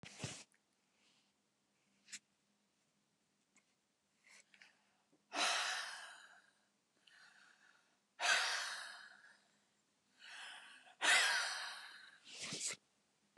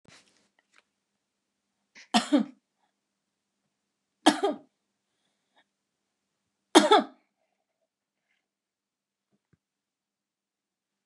{"exhalation_length": "13.4 s", "exhalation_amplitude": 3454, "exhalation_signal_mean_std_ratio": 0.36, "three_cough_length": "11.1 s", "three_cough_amplitude": 25825, "three_cough_signal_mean_std_ratio": 0.18, "survey_phase": "beta (2021-08-13 to 2022-03-07)", "age": "65+", "gender": "Female", "wearing_mask": "No", "symptom_none": true, "smoker_status": "Never smoked", "respiratory_condition_asthma": true, "respiratory_condition_other": false, "recruitment_source": "REACT", "submission_delay": "5 days", "covid_test_result": "Negative", "covid_test_method": "RT-qPCR", "influenza_a_test_result": "Negative", "influenza_b_test_result": "Negative"}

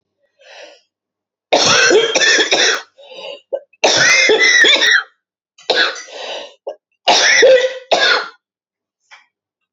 {"three_cough_length": "9.7 s", "three_cough_amplitude": 32312, "three_cough_signal_mean_std_ratio": 0.57, "survey_phase": "beta (2021-08-13 to 2022-03-07)", "age": "45-64", "gender": "Female", "wearing_mask": "No", "symptom_sore_throat": true, "smoker_status": "Never smoked", "respiratory_condition_asthma": false, "respiratory_condition_other": true, "recruitment_source": "Test and Trace", "submission_delay": "2 days", "covid_test_result": "Negative", "covid_test_method": "RT-qPCR"}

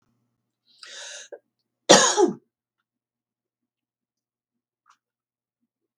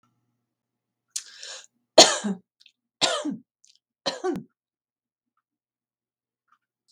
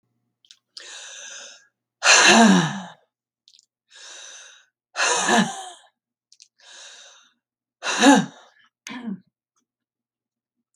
{"cough_length": "6.0 s", "cough_amplitude": 32768, "cough_signal_mean_std_ratio": 0.2, "three_cough_length": "6.9 s", "three_cough_amplitude": 32768, "three_cough_signal_mean_std_ratio": 0.21, "exhalation_length": "10.8 s", "exhalation_amplitude": 32768, "exhalation_signal_mean_std_ratio": 0.33, "survey_phase": "beta (2021-08-13 to 2022-03-07)", "age": "65+", "gender": "Female", "wearing_mask": "No", "symptom_none": true, "smoker_status": "Never smoked", "respiratory_condition_asthma": false, "respiratory_condition_other": false, "recruitment_source": "REACT", "submission_delay": "3 days", "covid_test_result": "Negative", "covid_test_method": "RT-qPCR"}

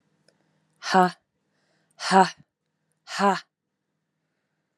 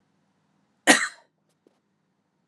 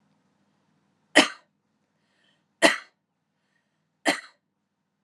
{"exhalation_length": "4.8 s", "exhalation_amplitude": 25481, "exhalation_signal_mean_std_ratio": 0.26, "cough_length": "2.5 s", "cough_amplitude": 31297, "cough_signal_mean_std_ratio": 0.2, "three_cough_length": "5.0 s", "three_cough_amplitude": 29741, "three_cough_signal_mean_std_ratio": 0.19, "survey_phase": "alpha (2021-03-01 to 2021-08-12)", "age": "18-44", "gender": "Female", "wearing_mask": "No", "symptom_none": true, "smoker_status": "Never smoked", "respiratory_condition_asthma": false, "respiratory_condition_other": false, "recruitment_source": "Test and Trace", "submission_delay": "0 days", "covid_test_result": "Negative", "covid_test_method": "RT-qPCR"}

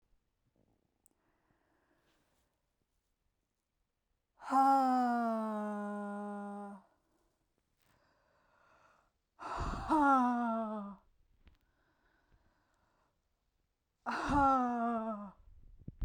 {"exhalation_length": "16.0 s", "exhalation_amplitude": 3648, "exhalation_signal_mean_std_ratio": 0.44, "survey_phase": "beta (2021-08-13 to 2022-03-07)", "age": "18-44", "gender": "Female", "wearing_mask": "No", "symptom_none": true, "smoker_status": "Ex-smoker", "respiratory_condition_asthma": false, "respiratory_condition_other": false, "recruitment_source": "REACT", "submission_delay": "0 days", "covid_test_result": "Negative", "covid_test_method": "RT-qPCR"}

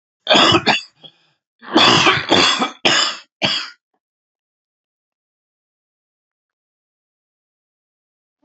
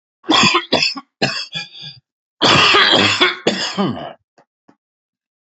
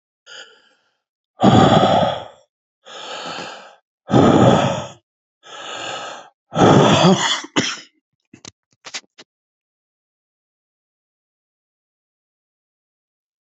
{"cough_length": "8.4 s", "cough_amplitude": 32125, "cough_signal_mean_std_ratio": 0.37, "three_cough_length": "5.5 s", "three_cough_amplitude": 31390, "three_cough_signal_mean_std_ratio": 0.54, "exhalation_length": "13.6 s", "exhalation_amplitude": 32768, "exhalation_signal_mean_std_ratio": 0.37, "survey_phase": "alpha (2021-03-01 to 2021-08-12)", "age": "65+", "gender": "Male", "wearing_mask": "No", "symptom_cough_any": true, "symptom_fatigue": true, "symptom_headache": true, "smoker_status": "Ex-smoker", "respiratory_condition_asthma": false, "respiratory_condition_other": false, "recruitment_source": "Test and Trace", "submission_delay": "2 days", "covid_test_result": "Positive", "covid_test_method": "RT-qPCR"}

